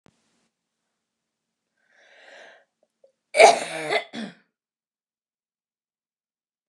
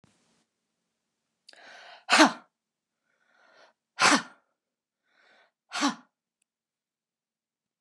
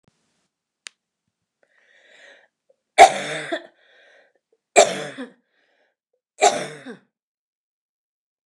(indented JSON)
{
  "cough_length": "6.7 s",
  "cough_amplitude": 29204,
  "cough_signal_mean_std_ratio": 0.19,
  "exhalation_length": "7.8 s",
  "exhalation_amplitude": 21890,
  "exhalation_signal_mean_std_ratio": 0.21,
  "three_cough_length": "8.5 s",
  "three_cough_amplitude": 29204,
  "three_cough_signal_mean_std_ratio": 0.21,
  "survey_phase": "beta (2021-08-13 to 2022-03-07)",
  "age": "65+",
  "gender": "Female",
  "wearing_mask": "No",
  "symptom_none": true,
  "smoker_status": "Never smoked",
  "respiratory_condition_asthma": false,
  "respiratory_condition_other": false,
  "recruitment_source": "REACT",
  "submission_delay": "1 day",
  "covid_test_result": "Negative",
  "covid_test_method": "RT-qPCR",
  "influenza_a_test_result": "Negative",
  "influenza_b_test_result": "Negative"
}